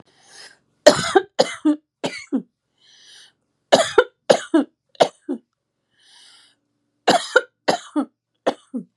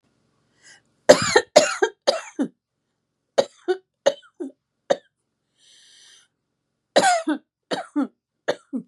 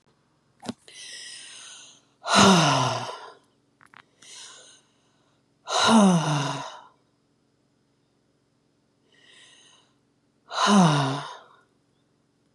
{"three_cough_length": "9.0 s", "three_cough_amplitude": 32768, "three_cough_signal_mean_std_ratio": 0.31, "cough_length": "8.9 s", "cough_amplitude": 32768, "cough_signal_mean_std_ratio": 0.3, "exhalation_length": "12.5 s", "exhalation_amplitude": 23442, "exhalation_signal_mean_std_ratio": 0.37, "survey_phase": "beta (2021-08-13 to 2022-03-07)", "age": "45-64", "gender": "Female", "wearing_mask": "No", "symptom_none": true, "smoker_status": "Never smoked", "respiratory_condition_asthma": false, "respiratory_condition_other": false, "recruitment_source": "REACT", "submission_delay": "3 days", "covid_test_result": "Negative", "covid_test_method": "RT-qPCR", "influenza_a_test_result": "Negative", "influenza_b_test_result": "Negative"}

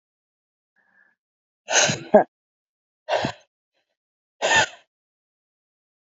{"exhalation_length": "6.1 s", "exhalation_amplitude": 27394, "exhalation_signal_mean_std_ratio": 0.27, "survey_phase": "beta (2021-08-13 to 2022-03-07)", "age": "18-44", "gender": "Female", "wearing_mask": "No", "symptom_cough_any": true, "symptom_new_continuous_cough": true, "symptom_runny_or_blocked_nose": true, "symptom_sore_throat": true, "symptom_fatigue": true, "symptom_fever_high_temperature": true, "symptom_headache": true, "symptom_change_to_sense_of_smell_or_taste": true, "symptom_loss_of_taste": true, "symptom_onset": "6 days", "smoker_status": "Never smoked", "respiratory_condition_asthma": false, "respiratory_condition_other": false, "recruitment_source": "Test and Trace", "submission_delay": "2 days", "covid_test_result": "Positive", "covid_test_method": "RT-qPCR", "covid_ct_value": 24.8, "covid_ct_gene": "ORF1ab gene"}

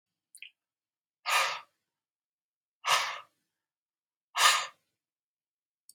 {"exhalation_length": "5.9 s", "exhalation_amplitude": 12547, "exhalation_signal_mean_std_ratio": 0.29, "survey_phase": "beta (2021-08-13 to 2022-03-07)", "age": "65+", "gender": "Male", "wearing_mask": "No", "symptom_sore_throat": true, "symptom_onset": "13 days", "smoker_status": "Never smoked", "respiratory_condition_asthma": false, "respiratory_condition_other": false, "recruitment_source": "REACT", "submission_delay": "0 days", "covid_test_result": "Negative", "covid_test_method": "RT-qPCR"}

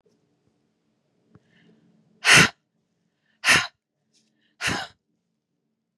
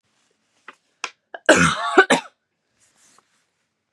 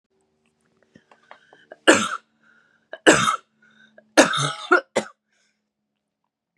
{"exhalation_length": "6.0 s", "exhalation_amplitude": 28773, "exhalation_signal_mean_std_ratio": 0.23, "cough_length": "3.9 s", "cough_amplitude": 32603, "cough_signal_mean_std_ratio": 0.29, "three_cough_length": "6.6 s", "three_cough_amplitude": 32681, "three_cough_signal_mean_std_ratio": 0.28, "survey_phase": "beta (2021-08-13 to 2022-03-07)", "age": "18-44", "gender": "Female", "wearing_mask": "No", "symptom_cough_any": true, "symptom_runny_or_blocked_nose": true, "symptom_fatigue": true, "smoker_status": "Ex-smoker", "respiratory_condition_asthma": false, "respiratory_condition_other": false, "recruitment_source": "Test and Trace", "submission_delay": "2 days", "covid_test_result": "Positive", "covid_test_method": "RT-qPCR", "covid_ct_value": 33.6, "covid_ct_gene": "N gene"}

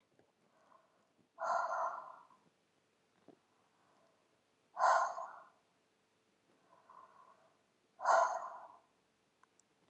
{"exhalation_length": "9.9 s", "exhalation_amplitude": 3966, "exhalation_signal_mean_std_ratio": 0.31, "survey_phase": "beta (2021-08-13 to 2022-03-07)", "age": "18-44", "gender": "Female", "wearing_mask": "No", "symptom_cough_any": true, "symptom_runny_or_blocked_nose": true, "symptom_abdominal_pain": true, "symptom_headache": true, "symptom_onset": "3 days", "smoker_status": "Current smoker (1 to 10 cigarettes per day)", "respiratory_condition_asthma": false, "respiratory_condition_other": false, "recruitment_source": "Test and Trace", "submission_delay": "2 days", "covid_test_result": "Positive", "covid_test_method": "RT-qPCR", "covid_ct_value": 31.9, "covid_ct_gene": "ORF1ab gene"}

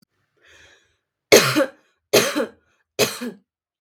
{"three_cough_length": "3.8 s", "three_cough_amplitude": 32768, "three_cough_signal_mean_std_ratio": 0.33, "survey_phase": "beta (2021-08-13 to 2022-03-07)", "age": "18-44", "gender": "Female", "wearing_mask": "No", "symptom_sore_throat": true, "smoker_status": "Never smoked", "respiratory_condition_asthma": false, "respiratory_condition_other": false, "recruitment_source": "REACT", "submission_delay": "1 day", "covid_test_result": "Negative", "covid_test_method": "RT-qPCR"}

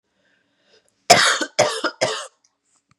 {"three_cough_length": "3.0 s", "three_cough_amplitude": 32768, "three_cough_signal_mean_std_ratio": 0.36, "survey_phase": "beta (2021-08-13 to 2022-03-07)", "age": "18-44", "gender": "Female", "wearing_mask": "No", "symptom_cough_any": true, "symptom_runny_or_blocked_nose": true, "symptom_sore_throat": true, "symptom_fatigue": true, "symptom_headache": true, "smoker_status": "Never smoked", "respiratory_condition_asthma": false, "respiratory_condition_other": false, "recruitment_source": "Test and Trace", "submission_delay": "2 days", "covid_test_result": "Positive", "covid_test_method": "LFT"}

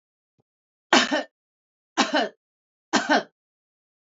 {"three_cough_length": "4.1 s", "three_cough_amplitude": 23101, "three_cough_signal_mean_std_ratio": 0.33, "survey_phase": "beta (2021-08-13 to 2022-03-07)", "age": "45-64", "gender": "Female", "wearing_mask": "No", "symptom_none": true, "smoker_status": "Ex-smoker", "respiratory_condition_asthma": false, "respiratory_condition_other": false, "recruitment_source": "REACT", "submission_delay": "0 days", "covid_test_result": "Negative", "covid_test_method": "RT-qPCR", "influenza_a_test_result": "Negative", "influenza_b_test_result": "Negative"}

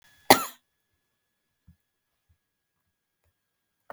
{"cough_length": "3.9 s", "cough_amplitude": 32768, "cough_signal_mean_std_ratio": 0.11, "survey_phase": "beta (2021-08-13 to 2022-03-07)", "age": "65+", "gender": "Female", "wearing_mask": "No", "symptom_none": true, "smoker_status": "Never smoked", "respiratory_condition_asthma": false, "respiratory_condition_other": false, "recruitment_source": "REACT", "submission_delay": "2 days", "covid_test_result": "Negative", "covid_test_method": "RT-qPCR", "influenza_a_test_result": "Negative", "influenza_b_test_result": "Negative"}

